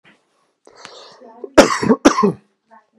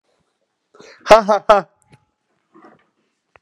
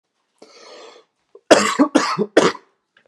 {
  "cough_length": "3.0 s",
  "cough_amplitude": 32768,
  "cough_signal_mean_std_ratio": 0.33,
  "exhalation_length": "3.4 s",
  "exhalation_amplitude": 32768,
  "exhalation_signal_mean_std_ratio": 0.24,
  "three_cough_length": "3.1 s",
  "three_cough_amplitude": 32768,
  "three_cough_signal_mean_std_ratio": 0.37,
  "survey_phase": "beta (2021-08-13 to 2022-03-07)",
  "age": "18-44",
  "gender": "Male",
  "wearing_mask": "No",
  "symptom_none": true,
  "smoker_status": "Never smoked",
  "respiratory_condition_asthma": false,
  "respiratory_condition_other": false,
  "recruitment_source": "REACT",
  "submission_delay": "1 day",
  "covid_test_result": "Negative",
  "covid_test_method": "RT-qPCR"
}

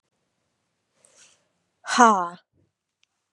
{
  "exhalation_length": "3.3 s",
  "exhalation_amplitude": 29989,
  "exhalation_signal_mean_std_ratio": 0.23,
  "survey_phase": "beta (2021-08-13 to 2022-03-07)",
  "age": "18-44",
  "gender": "Female",
  "wearing_mask": "No",
  "symptom_new_continuous_cough": true,
  "symptom_shortness_of_breath": true,
  "symptom_diarrhoea": true,
  "symptom_fatigue": true,
  "symptom_headache": true,
  "symptom_change_to_sense_of_smell_or_taste": true,
  "symptom_loss_of_taste": true,
  "smoker_status": "Ex-smoker",
  "respiratory_condition_asthma": false,
  "respiratory_condition_other": false,
  "recruitment_source": "Test and Trace",
  "submission_delay": "4 days",
  "covid_test_result": "Positive",
  "covid_test_method": "LFT"
}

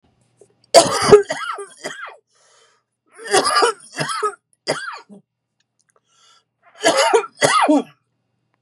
{
  "three_cough_length": "8.6 s",
  "three_cough_amplitude": 32768,
  "three_cough_signal_mean_std_ratio": 0.4,
  "survey_phase": "beta (2021-08-13 to 2022-03-07)",
  "age": "45-64",
  "gender": "Male",
  "wearing_mask": "No",
  "symptom_cough_any": true,
  "symptom_new_continuous_cough": true,
  "symptom_shortness_of_breath": true,
  "symptom_sore_throat": true,
  "symptom_abdominal_pain": true,
  "symptom_diarrhoea": true,
  "symptom_fatigue": true,
  "symptom_headache": true,
  "smoker_status": "Never smoked",
  "respiratory_condition_asthma": false,
  "respiratory_condition_other": false,
  "recruitment_source": "Test and Trace",
  "submission_delay": "1 day",
  "covid_test_result": "Positive",
  "covid_test_method": "ePCR"
}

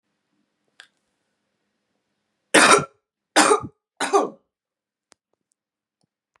{
  "three_cough_length": "6.4 s",
  "three_cough_amplitude": 30608,
  "three_cough_signal_mean_std_ratio": 0.26,
  "survey_phase": "beta (2021-08-13 to 2022-03-07)",
  "age": "45-64",
  "gender": "Female",
  "wearing_mask": "No",
  "symptom_cough_any": true,
  "symptom_runny_or_blocked_nose": true,
  "symptom_sore_throat": true,
  "symptom_fatigue": true,
  "symptom_fever_high_temperature": true,
  "symptom_headache": true,
  "smoker_status": "Ex-smoker",
  "respiratory_condition_asthma": false,
  "respiratory_condition_other": false,
  "recruitment_source": "Test and Trace",
  "submission_delay": "2 days",
  "covid_test_result": "Positive",
  "covid_test_method": "RT-qPCR",
  "covid_ct_value": 25.0,
  "covid_ct_gene": "ORF1ab gene",
  "covid_ct_mean": 25.5,
  "covid_viral_load": "4400 copies/ml",
  "covid_viral_load_category": "Minimal viral load (< 10K copies/ml)"
}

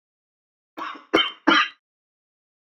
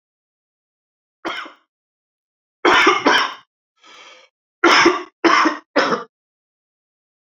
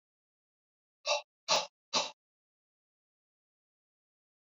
{
  "cough_length": "2.6 s",
  "cough_amplitude": 26249,
  "cough_signal_mean_std_ratio": 0.31,
  "three_cough_length": "7.3 s",
  "three_cough_amplitude": 29216,
  "three_cough_signal_mean_std_ratio": 0.38,
  "exhalation_length": "4.4 s",
  "exhalation_amplitude": 5812,
  "exhalation_signal_mean_std_ratio": 0.24,
  "survey_phase": "alpha (2021-03-01 to 2021-08-12)",
  "age": "45-64",
  "gender": "Male",
  "wearing_mask": "No",
  "symptom_none": true,
  "smoker_status": "Ex-smoker",
  "respiratory_condition_asthma": false,
  "respiratory_condition_other": false,
  "recruitment_source": "REACT",
  "submission_delay": "1 day",
  "covid_test_result": "Negative",
  "covid_test_method": "RT-qPCR"
}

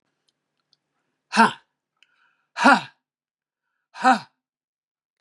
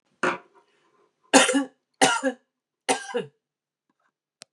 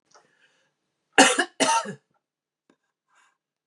{
  "exhalation_length": "5.2 s",
  "exhalation_amplitude": 28244,
  "exhalation_signal_mean_std_ratio": 0.24,
  "three_cough_length": "4.5 s",
  "three_cough_amplitude": 32209,
  "three_cough_signal_mean_std_ratio": 0.33,
  "cough_length": "3.7 s",
  "cough_amplitude": 31096,
  "cough_signal_mean_std_ratio": 0.27,
  "survey_phase": "beta (2021-08-13 to 2022-03-07)",
  "age": "65+",
  "gender": "Female",
  "wearing_mask": "No",
  "symptom_none": true,
  "smoker_status": "Ex-smoker",
  "respiratory_condition_asthma": false,
  "respiratory_condition_other": false,
  "recruitment_source": "REACT",
  "submission_delay": "3 days",
  "covid_test_result": "Negative",
  "covid_test_method": "RT-qPCR"
}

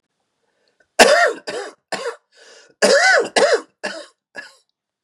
{
  "cough_length": "5.0 s",
  "cough_amplitude": 32768,
  "cough_signal_mean_std_ratio": 0.42,
  "survey_phase": "beta (2021-08-13 to 2022-03-07)",
  "age": "18-44",
  "gender": "Male",
  "wearing_mask": "No",
  "symptom_cough_any": true,
  "symptom_runny_or_blocked_nose": true,
  "symptom_fatigue": true,
  "symptom_headache": true,
  "smoker_status": "Current smoker (11 or more cigarettes per day)",
  "respiratory_condition_asthma": false,
  "respiratory_condition_other": false,
  "recruitment_source": "Test and Trace",
  "submission_delay": "2 days",
  "covid_test_result": "Negative",
  "covid_test_method": "RT-qPCR"
}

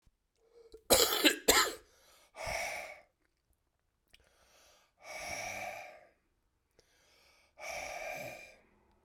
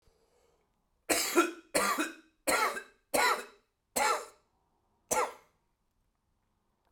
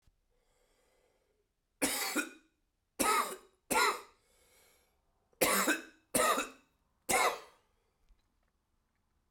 {
  "exhalation_length": "9.0 s",
  "exhalation_amplitude": 11565,
  "exhalation_signal_mean_std_ratio": 0.33,
  "cough_length": "6.9 s",
  "cough_amplitude": 8174,
  "cough_signal_mean_std_ratio": 0.42,
  "three_cough_length": "9.3 s",
  "three_cough_amplitude": 8122,
  "three_cough_signal_mean_std_ratio": 0.38,
  "survey_phase": "beta (2021-08-13 to 2022-03-07)",
  "age": "45-64",
  "gender": "Male",
  "wearing_mask": "No",
  "symptom_cough_any": true,
  "symptom_new_continuous_cough": true,
  "symptom_sore_throat": true,
  "symptom_fatigue": true,
  "symptom_fever_high_temperature": true,
  "symptom_headache": true,
  "symptom_onset": "3 days",
  "smoker_status": "Never smoked",
  "respiratory_condition_asthma": false,
  "respiratory_condition_other": false,
  "recruitment_source": "Test and Trace",
  "submission_delay": "1 day",
  "covid_test_result": "Positive",
  "covid_test_method": "RT-qPCR",
  "covid_ct_value": 20.4,
  "covid_ct_gene": "ORF1ab gene",
  "covid_ct_mean": 21.0,
  "covid_viral_load": "130000 copies/ml",
  "covid_viral_load_category": "Low viral load (10K-1M copies/ml)"
}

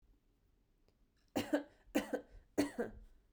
{
  "three_cough_length": "3.3 s",
  "three_cough_amplitude": 3368,
  "three_cough_signal_mean_std_ratio": 0.36,
  "survey_phase": "beta (2021-08-13 to 2022-03-07)",
  "age": "18-44",
  "gender": "Female",
  "wearing_mask": "No",
  "symptom_none": true,
  "smoker_status": "Never smoked",
  "respiratory_condition_asthma": false,
  "respiratory_condition_other": false,
  "recruitment_source": "REACT",
  "submission_delay": "8 days",
  "covid_test_result": "Negative",
  "covid_test_method": "RT-qPCR"
}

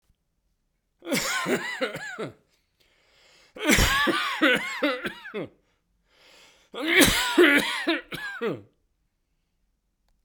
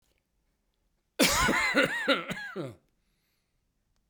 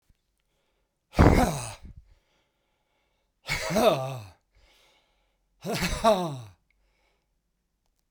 {
  "three_cough_length": "10.2 s",
  "three_cough_amplitude": 27186,
  "three_cough_signal_mean_std_ratio": 0.48,
  "cough_length": "4.1 s",
  "cough_amplitude": 11766,
  "cough_signal_mean_std_ratio": 0.45,
  "exhalation_length": "8.1 s",
  "exhalation_amplitude": 21330,
  "exhalation_signal_mean_std_ratio": 0.34,
  "survey_phase": "beta (2021-08-13 to 2022-03-07)",
  "age": "65+",
  "gender": "Male",
  "wearing_mask": "No",
  "symptom_cough_any": true,
  "symptom_runny_or_blocked_nose": true,
  "symptom_headache": true,
  "symptom_other": true,
  "smoker_status": "Ex-smoker",
  "respiratory_condition_asthma": false,
  "respiratory_condition_other": false,
  "recruitment_source": "Test and Trace",
  "submission_delay": "2 days",
  "covid_test_result": "Positive",
  "covid_test_method": "RT-qPCR",
  "covid_ct_value": 20.3,
  "covid_ct_gene": "N gene"
}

